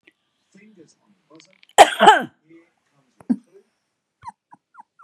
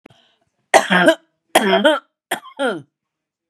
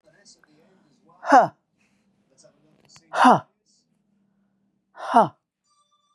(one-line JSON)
{"cough_length": "5.0 s", "cough_amplitude": 32768, "cough_signal_mean_std_ratio": 0.21, "three_cough_length": "3.5 s", "three_cough_amplitude": 32768, "three_cough_signal_mean_std_ratio": 0.41, "exhalation_length": "6.1 s", "exhalation_amplitude": 27831, "exhalation_signal_mean_std_ratio": 0.24, "survey_phase": "beta (2021-08-13 to 2022-03-07)", "age": "45-64", "gender": "Female", "wearing_mask": "No", "symptom_cough_any": true, "symptom_runny_or_blocked_nose": true, "symptom_shortness_of_breath": true, "symptom_sore_throat": true, "symptom_fatigue": true, "symptom_headache": true, "symptom_onset": "5 days", "smoker_status": "Never smoked", "respiratory_condition_asthma": false, "respiratory_condition_other": false, "recruitment_source": "REACT", "submission_delay": "1 day", "covid_test_result": "Positive", "covid_test_method": "RT-qPCR", "covid_ct_value": 18.9, "covid_ct_gene": "E gene", "influenza_a_test_result": "Negative", "influenza_b_test_result": "Negative"}